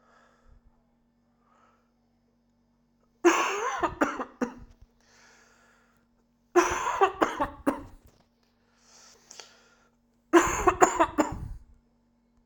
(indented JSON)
{
  "three_cough_length": "12.5 s",
  "three_cough_amplitude": 32767,
  "three_cough_signal_mean_std_ratio": 0.33,
  "survey_phase": "alpha (2021-03-01 to 2021-08-12)",
  "age": "45-64",
  "gender": "Male",
  "wearing_mask": "No",
  "symptom_cough_any": true,
  "symptom_fatigue": true,
  "symptom_change_to_sense_of_smell_or_taste": true,
  "symptom_loss_of_taste": true,
  "symptom_onset": "3 days",
  "smoker_status": "Never smoked",
  "respiratory_condition_asthma": false,
  "respiratory_condition_other": false,
  "recruitment_source": "Test and Trace",
  "submission_delay": "2 days",
  "covid_test_result": "Positive",
  "covid_test_method": "RT-qPCR"
}